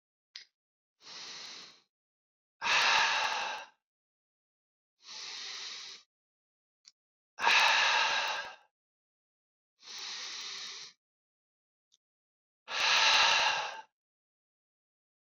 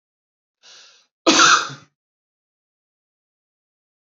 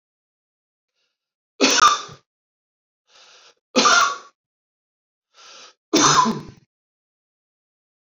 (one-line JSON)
{"exhalation_length": "15.3 s", "exhalation_amplitude": 7993, "exhalation_signal_mean_std_ratio": 0.41, "cough_length": "4.1 s", "cough_amplitude": 28728, "cough_signal_mean_std_ratio": 0.25, "three_cough_length": "8.1 s", "three_cough_amplitude": 26329, "three_cough_signal_mean_std_ratio": 0.32, "survey_phase": "beta (2021-08-13 to 2022-03-07)", "age": "45-64", "gender": "Male", "wearing_mask": "No", "symptom_none": true, "smoker_status": "Never smoked", "respiratory_condition_asthma": false, "respiratory_condition_other": false, "recruitment_source": "REACT", "submission_delay": "1 day", "covid_test_result": "Negative", "covid_test_method": "RT-qPCR"}